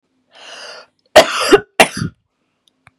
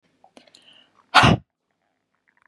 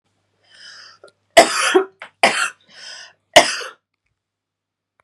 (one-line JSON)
{"cough_length": "3.0 s", "cough_amplitude": 32768, "cough_signal_mean_std_ratio": 0.31, "exhalation_length": "2.5 s", "exhalation_amplitude": 30792, "exhalation_signal_mean_std_ratio": 0.24, "three_cough_length": "5.0 s", "three_cough_amplitude": 32768, "three_cough_signal_mean_std_ratio": 0.3, "survey_phase": "beta (2021-08-13 to 2022-03-07)", "age": "18-44", "gender": "Female", "wearing_mask": "No", "symptom_cough_any": true, "symptom_runny_or_blocked_nose": true, "symptom_onset": "2 days", "smoker_status": "Never smoked", "respiratory_condition_asthma": false, "respiratory_condition_other": false, "recruitment_source": "Test and Trace", "submission_delay": "1 day", "covid_test_result": "Positive", "covid_test_method": "RT-qPCR", "covid_ct_value": 21.2, "covid_ct_gene": "ORF1ab gene", "covid_ct_mean": 21.5, "covid_viral_load": "89000 copies/ml", "covid_viral_load_category": "Low viral load (10K-1M copies/ml)"}